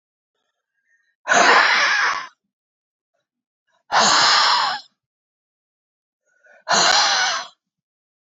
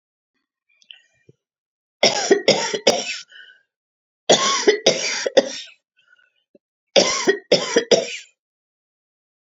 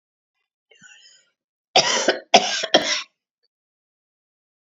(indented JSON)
{
  "exhalation_length": "8.4 s",
  "exhalation_amplitude": 29109,
  "exhalation_signal_mean_std_ratio": 0.46,
  "three_cough_length": "9.6 s",
  "three_cough_amplitude": 32768,
  "three_cough_signal_mean_std_ratio": 0.39,
  "cough_length": "4.7 s",
  "cough_amplitude": 32767,
  "cough_signal_mean_std_ratio": 0.31,
  "survey_phase": "beta (2021-08-13 to 2022-03-07)",
  "age": "65+",
  "gender": "Female",
  "wearing_mask": "No",
  "symptom_none": true,
  "smoker_status": "Ex-smoker",
  "respiratory_condition_asthma": false,
  "respiratory_condition_other": false,
  "recruitment_source": "REACT",
  "submission_delay": "1 day",
  "covid_test_result": "Negative",
  "covid_test_method": "RT-qPCR",
  "influenza_a_test_result": "Negative",
  "influenza_b_test_result": "Negative"
}